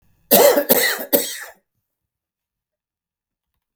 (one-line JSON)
{"three_cough_length": "3.8 s", "three_cough_amplitude": 32768, "three_cough_signal_mean_std_ratio": 0.36, "survey_phase": "beta (2021-08-13 to 2022-03-07)", "age": "65+", "gender": "Male", "wearing_mask": "No", "symptom_none": true, "smoker_status": "Never smoked", "respiratory_condition_asthma": false, "respiratory_condition_other": false, "recruitment_source": "REACT", "submission_delay": "0 days", "covid_test_result": "Negative", "covid_test_method": "RT-qPCR", "influenza_a_test_result": "Negative", "influenza_b_test_result": "Negative"}